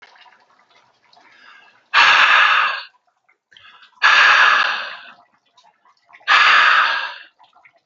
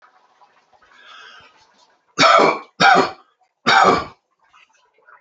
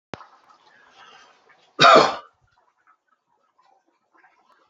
exhalation_length: 7.9 s
exhalation_amplitude: 32768
exhalation_signal_mean_std_ratio: 0.48
three_cough_length: 5.2 s
three_cough_amplitude: 29561
three_cough_signal_mean_std_ratio: 0.37
cough_length: 4.7 s
cough_amplitude: 28253
cough_signal_mean_std_ratio: 0.22
survey_phase: beta (2021-08-13 to 2022-03-07)
age: 45-64
gender: Female
wearing_mask: 'No'
symptom_cough_any: true
smoker_status: Never smoked
respiratory_condition_asthma: false
respiratory_condition_other: false
recruitment_source: Test and Trace
submission_delay: 1 day
covid_test_result: Negative
covid_test_method: LFT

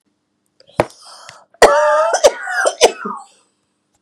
three_cough_length: 4.0 s
three_cough_amplitude: 32768
three_cough_signal_mean_std_ratio: 0.42
survey_phase: beta (2021-08-13 to 2022-03-07)
age: 45-64
gender: Female
wearing_mask: 'No'
symptom_cough_any: true
symptom_fatigue: true
smoker_status: Never smoked
respiratory_condition_asthma: false
respiratory_condition_other: false
recruitment_source: Test and Trace
submission_delay: 2 days
covid_test_result: Positive
covid_test_method: RT-qPCR
covid_ct_value: 16.2
covid_ct_gene: ORF1ab gene
covid_ct_mean: 16.6
covid_viral_load: 3500000 copies/ml
covid_viral_load_category: High viral load (>1M copies/ml)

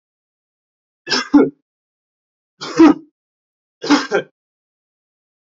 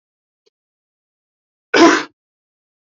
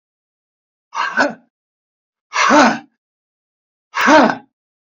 three_cough_length: 5.5 s
three_cough_amplitude: 28739
three_cough_signal_mean_std_ratio: 0.28
cough_length: 3.0 s
cough_amplitude: 28495
cough_signal_mean_std_ratio: 0.24
exhalation_length: 4.9 s
exhalation_amplitude: 30980
exhalation_signal_mean_std_ratio: 0.37
survey_phase: alpha (2021-03-01 to 2021-08-12)
age: 18-44
gender: Male
wearing_mask: 'No'
symptom_diarrhoea: true
smoker_status: Current smoker (e-cigarettes or vapes only)
respiratory_condition_asthma: false
respiratory_condition_other: false
recruitment_source: REACT
submission_delay: 1 day
covid_test_result: Negative
covid_test_method: RT-qPCR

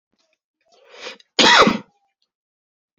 cough_length: 3.0 s
cough_amplitude: 32533
cough_signal_mean_std_ratio: 0.29
survey_phase: alpha (2021-03-01 to 2021-08-12)
age: 18-44
gender: Male
wearing_mask: 'No'
symptom_cough_any: true
symptom_shortness_of_breath: true
symptom_fatigue: true
symptom_headache: true
symptom_loss_of_taste: true
symptom_onset: 4 days
smoker_status: Never smoked
respiratory_condition_asthma: false
respiratory_condition_other: false
recruitment_source: Test and Trace
submission_delay: 2 days
covid_test_result: Positive
covid_test_method: RT-qPCR
covid_ct_value: 13.7
covid_ct_gene: N gene
covid_ct_mean: 14.0
covid_viral_load: 25000000 copies/ml
covid_viral_load_category: High viral load (>1M copies/ml)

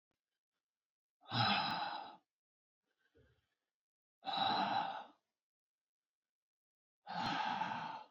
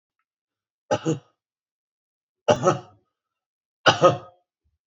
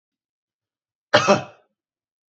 exhalation_length: 8.1 s
exhalation_amplitude: 2503
exhalation_signal_mean_std_ratio: 0.45
three_cough_length: 4.9 s
three_cough_amplitude: 30033
three_cough_signal_mean_std_ratio: 0.27
cough_length: 2.3 s
cough_amplitude: 27810
cough_signal_mean_std_ratio: 0.24
survey_phase: beta (2021-08-13 to 2022-03-07)
age: 18-44
gender: Male
wearing_mask: 'No'
symptom_cough_any: true
symptom_runny_or_blocked_nose: true
symptom_shortness_of_breath: true
symptom_sore_throat: true
symptom_fatigue: true
symptom_fever_high_temperature: true
symptom_headache: true
symptom_other: true
symptom_onset: 3 days
smoker_status: Never smoked
respiratory_condition_asthma: true
respiratory_condition_other: false
recruitment_source: Test and Trace
submission_delay: 2 days
covid_test_result: Positive
covid_test_method: RT-qPCR
covid_ct_value: 18.8
covid_ct_gene: ORF1ab gene
covid_ct_mean: 19.3
covid_viral_load: 460000 copies/ml
covid_viral_load_category: Low viral load (10K-1M copies/ml)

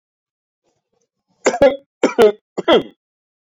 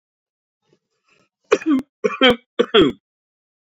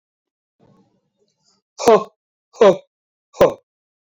three_cough_length: 3.5 s
three_cough_amplitude: 27623
three_cough_signal_mean_std_ratio: 0.33
cough_length: 3.7 s
cough_amplitude: 30225
cough_signal_mean_std_ratio: 0.34
exhalation_length: 4.0 s
exhalation_amplitude: 27925
exhalation_signal_mean_std_ratio: 0.27
survey_phase: beta (2021-08-13 to 2022-03-07)
age: 45-64
gender: Male
wearing_mask: 'No'
symptom_none: true
smoker_status: Never smoked
respiratory_condition_asthma: false
respiratory_condition_other: false
recruitment_source: REACT
submission_delay: 2 days
covid_test_result: Negative
covid_test_method: RT-qPCR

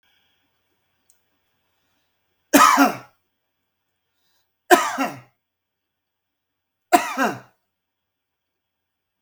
three_cough_length: 9.2 s
three_cough_amplitude: 32768
three_cough_signal_mean_std_ratio: 0.24
survey_phase: beta (2021-08-13 to 2022-03-07)
age: 65+
gender: Male
wearing_mask: 'No'
symptom_none: true
smoker_status: Ex-smoker
respiratory_condition_asthma: true
respiratory_condition_other: false
recruitment_source: REACT
submission_delay: 1 day
covid_test_result: Negative
covid_test_method: RT-qPCR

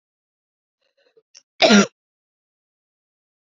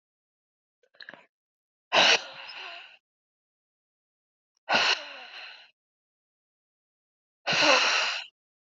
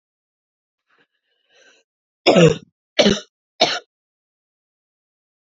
cough_length: 3.4 s
cough_amplitude: 28824
cough_signal_mean_std_ratio: 0.21
exhalation_length: 8.6 s
exhalation_amplitude: 16905
exhalation_signal_mean_std_ratio: 0.33
three_cough_length: 5.5 s
three_cough_amplitude: 30634
three_cough_signal_mean_std_ratio: 0.25
survey_phase: beta (2021-08-13 to 2022-03-07)
age: 18-44
gender: Female
wearing_mask: 'No'
symptom_cough_any: true
symptom_runny_or_blocked_nose: true
symptom_abdominal_pain: true
symptom_diarrhoea: true
symptom_onset: 5 days
smoker_status: Ex-smoker
respiratory_condition_asthma: false
respiratory_condition_other: false
recruitment_source: REACT
submission_delay: 1 day
covid_test_result: Negative
covid_test_method: RT-qPCR
influenza_a_test_result: Unknown/Void
influenza_b_test_result: Unknown/Void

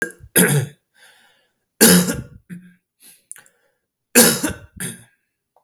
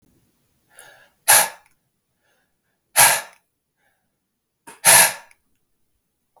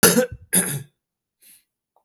three_cough_length: 5.6 s
three_cough_amplitude: 32768
three_cough_signal_mean_std_ratio: 0.35
exhalation_length: 6.4 s
exhalation_amplitude: 32766
exhalation_signal_mean_std_ratio: 0.26
cough_length: 2.0 s
cough_amplitude: 29545
cough_signal_mean_std_ratio: 0.37
survey_phase: beta (2021-08-13 to 2022-03-07)
age: 45-64
gender: Male
wearing_mask: 'No'
symptom_runny_or_blocked_nose: true
symptom_change_to_sense_of_smell_or_taste: true
smoker_status: Ex-smoker
respiratory_condition_asthma: false
respiratory_condition_other: false
recruitment_source: Test and Trace
submission_delay: 2 days
covid_test_result: Positive
covid_test_method: LFT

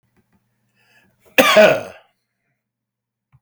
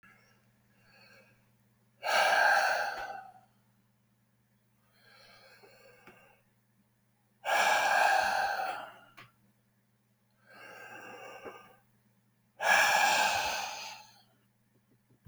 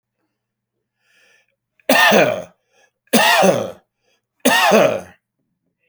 cough_length: 3.4 s
cough_amplitude: 31336
cough_signal_mean_std_ratio: 0.28
exhalation_length: 15.3 s
exhalation_amplitude: 7953
exhalation_signal_mean_std_ratio: 0.42
three_cough_length: 5.9 s
three_cough_amplitude: 32768
three_cough_signal_mean_std_ratio: 0.44
survey_phase: beta (2021-08-13 to 2022-03-07)
age: 65+
gender: Male
wearing_mask: 'No'
symptom_none: true
smoker_status: Ex-smoker
respiratory_condition_asthma: false
respiratory_condition_other: false
recruitment_source: REACT
submission_delay: 22 days
covid_test_result: Negative
covid_test_method: RT-qPCR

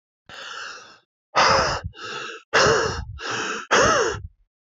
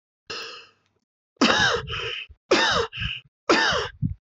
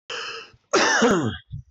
exhalation_length: 4.8 s
exhalation_amplitude: 20285
exhalation_signal_mean_std_ratio: 0.56
three_cough_length: 4.4 s
three_cough_amplitude: 15656
three_cough_signal_mean_std_ratio: 0.54
cough_length: 1.7 s
cough_amplitude: 13135
cough_signal_mean_std_ratio: 0.63
survey_phase: beta (2021-08-13 to 2022-03-07)
age: 18-44
gender: Male
wearing_mask: 'No'
symptom_sore_throat: true
symptom_fatigue: true
symptom_loss_of_taste: true
symptom_onset: 3 days
smoker_status: Ex-smoker
respiratory_condition_asthma: false
respiratory_condition_other: false
recruitment_source: Test and Trace
submission_delay: 2 days
covid_test_result: Positive
covid_test_method: ePCR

